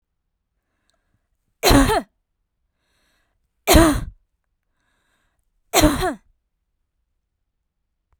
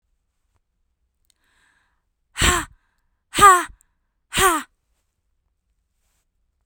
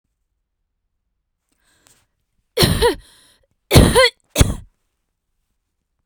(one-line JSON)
{"three_cough_length": "8.2 s", "three_cough_amplitude": 32768, "three_cough_signal_mean_std_ratio": 0.28, "exhalation_length": "6.7 s", "exhalation_amplitude": 32768, "exhalation_signal_mean_std_ratio": 0.25, "cough_length": "6.1 s", "cough_amplitude": 32768, "cough_signal_mean_std_ratio": 0.29, "survey_phase": "beta (2021-08-13 to 2022-03-07)", "age": "18-44", "gender": "Female", "wearing_mask": "No", "symptom_none": true, "smoker_status": "Ex-smoker", "respiratory_condition_asthma": false, "respiratory_condition_other": false, "recruitment_source": "REACT", "submission_delay": "3 days", "covid_test_result": "Negative", "covid_test_method": "RT-qPCR"}